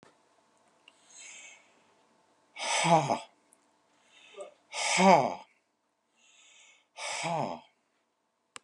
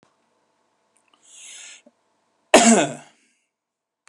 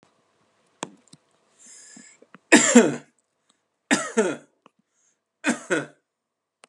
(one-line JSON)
{"exhalation_length": "8.6 s", "exhalation_amplitude": 14902, "exhalation_signal_mean_std_ratio": 0.32, "cough_length": "4.1 s", "cough_amplitude": 32767, "cough_signal_mean_std_ratio": 0.24, "three_cough_length": "6.7 s", "three_cough_amplitude": 32555, "three_cough_signal_mean_std_ratio": 0.26, "survey_phase": "beta (2021-08-13 to 2022-03-07)", "age": "65+", "gender": "Male", "wearing_mask": "No", "symptom_none": true, "smoker_status": "Never smoked", "respiratory_condition_asthma": false, "respiratory_condition_other": false, "recruitment_source": "REACT", "submission_delay": "1 day", "covid_test_result": "Negative", "covid_test_method": "RT-qPCR"}